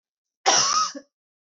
{"cough_length": "1.5 s", "cough_amplitude": 16892, "cough_signal_mean_std_ratio": 0.46, "survey_phase": "beta (2021-08-13 to 2022-03-07)", "age": "18-44", "gender": "Female", "wearing_mask": "No", "symptom_cough_any": true, "symptom_new_continuous_cough": true, "symptom_runny_or_blocked_nose": true, "symptom_sore_throat": true, "symptom_fatigue": true, "symptom_onset": "2 days", "smoker_status": "Never smoked", "respiratory_condition_asthma": false, "respiratory_condition_other": false, "recruitment_source": "Test and Trace", "submission_delay": "2 days", "covid_test_result": "Positive", "covid_test_method": "RT-qPCR", "covid_ct_value": 27.0, "covid_ct_gene": "ORF1ab gene", "covid_ct_mean": 27.3, "covid_viral_load": "1100 copies/ml", "covid_viral_load_category": "Minimal viral load (< 10K copies/ml)"}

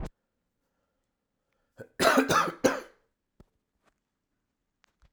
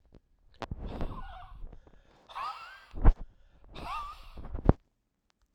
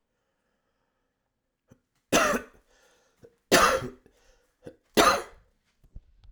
{"cough_length": "5.1 s", "cough_amplitude": 16461, "cough_signal_mean_std_ratio": 0.28, "exhalation_length": "5.5 s", "exhalation_amplitude": 26366, "exhalation_signal_mean_std_ratio": 0.29, "three_cough_length": "6.3 s", "three_cough_amplitude": 23216, "three_cough_signal_mean_std_ratio": 0.29, "survey_phase": "alpha (2021-03-01 to 2021-08-12)", "age": "45-64", "gender": "Male", "wearing_mask": "No", "symptom_cough_any": true, "symptom_new_continuous_cough": true, "symptom_headache": true, "symptom_onset": "2 days", "smoker_status": "Ex-smoker", "respiratory_condition_asthma": false, "respiratory_condition_other": false, "recruitment_source": "Test and Trace", "submission_delay": "1 day", "covid_test_result": "Positive", "covid_test_method": "RT-qPCR", "covid_ct_value": 25.3, "covid_ct_gene": "ORF1ab gene"}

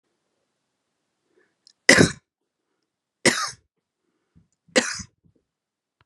{"three_cough_length": "6.1 s", "three_cough_amplitude": 32768, "three_cough_signal_mean_std_ratio": 0.21, "survey_phase": "beta (2021-08-13 to 2022-03-07)", "age": "18-44", "gender": "Female", "wearing_mask": "No", "symptom_none": true, "smoker_status": "Current smoker (1 to 10 cigarettes per day)", "respiratory_condition_asthma": false, "respiratory_condition_other": false, "recruitment_source": "REACT", "submission_delay": "2 days", "covid_test_result": "Negative", "covid_test_method": "RT-qPCR", "influenza_a_test_result": "Negative", "influenza_b_test_result": "Negative"}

